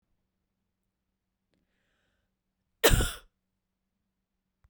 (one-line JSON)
{"cough_length": "4.7 s", "cough_amplitude": 16593, "cough_signal_mean_std_ratio": 0.18, "survey_phase": "beta (2021-08-13 to 2022-03-07)", "age": "45-64", "gender": "Female", "wearing_mask": "No", "symptom_fatigue": true, "smoker_status": "Never smoked", "respiratory_condition_asthma": false, "respiratory_condition_other": false, "recruitment_source": "REACT", "submission_delay": "2 days", "covid_test_result": "Negative", "covid_test_method": "RT-qPCR"}